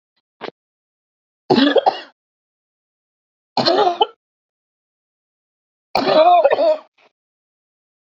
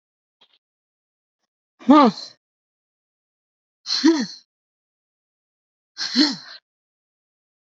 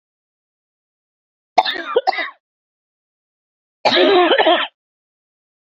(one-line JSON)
{"three_cough_length": "8.2 s", "three_cough_amplitude": 28058, "three_cough_signal_mean_std_ratio": 0.36, "exhalation_length": "7.7 s", "exhalation_amplitude": 26713, "exhalation_signal_mean_std_ratio": 0.26, "cough_length": "5.7 s", "cough_amplitude": 28760, "cough_signal_mean_std_ratio": 0.37, "survey_phase": "alpha (2021-03-01 to 2021-08-12)", "age": "18-44", "gender": "Female", "wearing_mask": "No", "symptom_diarrhoea": true, "symptom_fatigue": true, "symptom_headache": true, "symptom_change_to_sense_of_smell_or_taste": true, "symptom_onset": "4 days", "smoker_status": "Never smoked", "respiratory_condition_asthma": false, "respiratory_condition_other": false, "recruitment_source": "Test and Trace", "submission_delay": "1 day", "covid_test_result": "Positive", "covid_test_method": "RT-qPCR", "covid_ct_value": 19.5, "covid_ct_gene": "ORF1ab gene", "covid_ct_mean": 20.1, "covid_viral_load": "260000 copies/ml", "covid_viral_load_category": "Low viral load (10K-1M copies/ml)"}